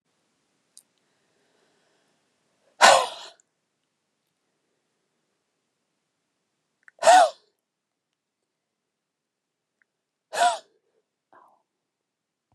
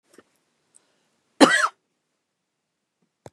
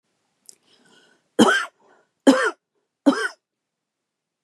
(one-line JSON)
{"exhalation_length": "12.5 s", "exhalation_amplitude": 29590, "exhalation_signal_mean_std_ratio": 0.18, "cough_length": "3.3 s", "cough_amplitude": 32657, "cough_signal_mean_std_ratio": 0.2, "three_cough_length": "4.4 s", "three_cough_amplitude": 30167, "three_cough_signal_mean_std_ratio": 0.29, "survey_phase": "beta (2021-08-13 to 2022-03-07)", "age": "18-44", "gender": "Female", "wearing_mask": "No", "symptom_cough_any": true, "symptom_runny_or_blocked_nose": true, "symptom_headache": true, "symptom_onset": "8 days", "smoker_status": "Ex-smoker", "respiratory_condition_asthma": true, "respiratory_condition_other": false, "recruitment_source": "REACT", "submission_delay": "2 days", "covid_test_result": "Negative", "covid_test_method": "RT-qPCR", "influenza_a_test_result": "Unknown/Void", "influenza_b_test_result": "Unknown/Void"}